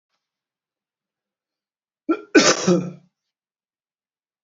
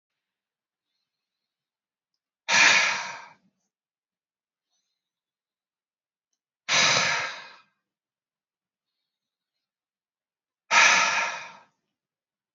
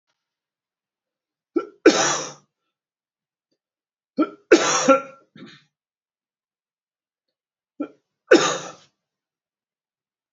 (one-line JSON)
{"cough_length": "4.4 s", "cough_amplitude": 30483, "cough_signal_mean_std_ratio": 0.26, "exhalation_length": "12.5 s", "exhalation_amplitude": 20175, "exhalation_signal_mean_std_ratio": 0.3, "three_cough_length": "10.3 s", "three_cough_amplitude": 30484, "three_cough_signal_mean_std_ratio": 0.25, "survey_phase": "beta (2021-08-13 to 2022-03-07)", "age": "45-64", "gender": "Male", "wearing_mask": "No", "symptom_cough_any": true, "symptom_runny_or_blocked_nose": true, "symptom_fatigue": true, "symptom_fever_high_temperature": true, "symptom_headache": true, "symptom_change_to_sense_of_smell_or_taste": true, "symptom_loss_of_taste": true, "smoker_status": "Ex-smoker", "respiratory_condition_asthma": false, "respiratory_condition_other": false, "recruitment_source": "Test and Trace", "submission_delay": "2 days", "covid_test_result": "Positive", "covid_test_method": "RT-qPCR", "covid_ct_value": 22.3, "covid_ct_gene": "N gene", "covid_ct_mean": 23.1, "covid_viral_load": "26000 copies/ml", "covid_viral_load_category": "Low viral load (10K-1M copies/ml)"}